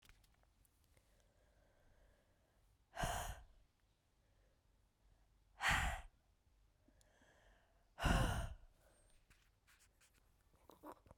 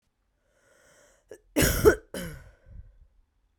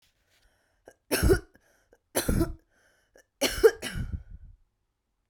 {
  "exhalation_length": "11.2 s",
  "exhalation_amplitude": 2156,
  "exhalation_signal_mean_std_ratio": 0.3,
  "cough_length": "3.6 s",
  "cough_amplitude": 19842,
  "cough_signal_mean_std_ratio": 0.28,
  "three_cough_length": "5.3 s",
  "three_cough_amplitude": 13961,
  "three_cough_signal_mean_std_ratio": 0.33,
  "survey_phase": "beta (2021-08-13 to 2022-03-07)",
  "age": "18-44",
  "gender": "Female",
  "wearing_mask": "No",
  "symptom_cough_any": true,
  "symptom_runny_or_blocked_nose": true,
  "symptom_sore_throat": true,
  "symptom_fever_high_temperature": true,
  "symptom_headache": true,
  "symptom_change_to_sense_of_smell_or_taste": true,
  "symptom_onset": "5 days",
  "smoker_status": "Never smoked",
  "respiratory_condition_asthma": false,
  "respiratory_condition_other": false,
  "recruitment_source": "Test and Trace",
  "submission_delay": "2 days",
  "covid_test_result": "Positive",
  "covid_test_method": "RT-qPCR",
  "covid_ct_value": 16.2,
  "covid_ct_gene": "ORF1ab gene",
  "covid_ct_mean": 17.3,
  "covid_viral_load": "2200000 copies/ml",
  "covid_viral_load_category": "High viral load (>1M copies/ml)"
}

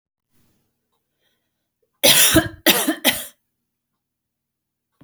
{
  "cough_length": "5.0 s",
  "cough_amplitude": 32768,
  "cough_signal_mean_std_ratio": 0.31,
  "survey_phase": "alpha (2021-03-01 to 2021-08-12)",
  "age": "45-64",
  "gender": "Female",
  "wearing_mask": "No",
  "symptom_none": true,
  "smoker_status": "Ex-smoker",
  "respiratory_condition_asthma": false,
  "respiratory_condition_other": false,
  "recruitment_source": "REACT",
  "submission_delay": "2 days",
  "covid_test_result": "Negative",
  "covid_test_method": "RT-qPCR"
}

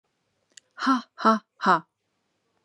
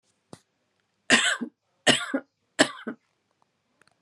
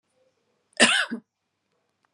{
  "exhalation_length": "2.6 s",
  "exhalation_amplitude": 18489,
  "exhalation_signal_mean_std_ratio": 0.33,
  "three_cough_length": "4.0 s",
  "three_cough_amplitude": 27892,
  "three_cough_signal_mean_std_ratio": 0.3,
  "cough_length": "2.1 s",
  "cough_amplitude": 23572,
  "cough_signal_mean_std_ratio": 0.28,
  "survey_phase": "beta (2021-08-13 to 2022-03-07)",
  "age": "45-64",
  "gender": "Female",
  "wearing_mask": "No",
  "symptom_none": true,
  "smoker_status": "Never smoked",
  "respiratory_condition_asthma": false,
  "respiratory_condition_other": false,
  "recruitment_source": "Test and Trace",
  "submission_delay": "1 day",
  "covid_test_result": "Negative",
  "covid_test_method": "RT-qPCR"
}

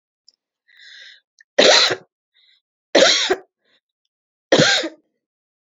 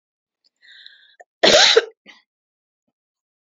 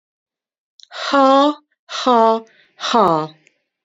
{
  "three_cough_length": "5.6 s",
  "three_cough_amplitude": 31490,
  "three_cough_signal_mean_std_ratio": 0.35,
  "cough_length": "3.5 s",
  "cough_amplitude": 31276,
  "cough_signal_mean_std_ratio": 0.27,
  "exhalation_length": "3.8 s",
  "exhalation_amplitude": 29135,
  "exhalation_signal_mean_std_ratio": 0.45,
  "survey_phase": "beta (2021-08-13 to 2022-03-07)",
  "age": "65+",
  "gender": "Female",
  "wearing_mask": "No",
  "symptom_none": true,
  "smoker_status": "Never smoked",
  "respiratory_condition_asthma": false,
  "respiratory_condition_other": false,
  "recruitment_source": "REACT",
  "submission_delay": "7 days",
  "covid_test_result": "Negative",
  "covid_test_method": "RT-qPCR"
}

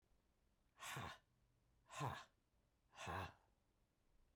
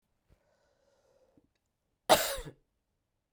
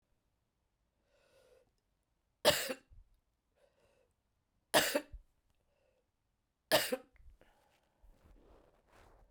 {
  "exhalation_length": "4.4 s",
  "exhalation_amplitude": 770,
  "exhalation_signal_mean_std_ratio": 0.42,
  "cough_length": "3.3 s",
  "cough_amplitude": 11869,
  "cough_signal_mean_std_ratio": 0.2,
  "three_cough_length": "9.3 s",
  "three_cough_amplitude": 6812,
  "three_cough_signal_mean_std_ratio": 0.22,
  "survey_phase": "beta (2021-08-13 to 2022-03-07)",
  "age": "45-64",
  "gender": "Female",
  "wearing_mask": "No",
  "symptom_cough_any": true,
  "symptom_new_continuous_cough": true,
  "symptom_runny_or_blocked_nose": true,
  "symptom_diarrhoea": true,
  "symptom_fatigue": true,
  "symptom_fever_high_temperature": true,
  "symptom_headache": true,
  "smoker_status": "Current smoker (1 to 10 cigarettes per day)",
  "respiratory_condition_asthma": false,
  "respiratory_condition_other": false,
  "recruitment_source": "Test and Trace",
  "submission_delay": "2 days",
  "covid_test_result": "Positive",
  "covid_test_method": "LFT"
}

